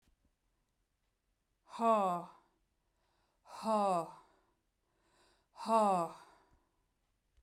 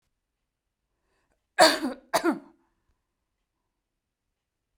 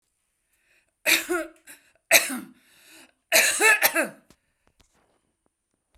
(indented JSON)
{
  "exhalation_length": "7.4 s",
  "exhalation_amplitude": 4040,
  "exhalation_signal_mean_std_ratio": 0.36,
  "cough_length": "4.8 s",
  "cough_amplitude": 26009,
  "cough_signal_mean_std_ratio": 0.22,
  "three_cough_length": "6.0 s",
  "three_cough_amplitude": 32767,
  "three_cough_signal_mean_std_ratio": 0.35,
  "survey_phase": "beta (2021-08-13 to 2022-03-07)",
  "age": "45-64",
  "gender": "Female",
  "wearing_mask": "No",
  "symptom_none": true,
  "smoker_status": "Never smoked",
  "respiratory_condition_asthma": false,
  "respiratory_condition_other": false,
  "recruitment_source": "REACT",
  "submission_delay": "2 days",
  "covid_test_result": "Negative",
  "covid_test_method": "RT-qPCR",
  "influenza_a_test_result": "Negative",
  "influenza_b_test_result": "Negative"
}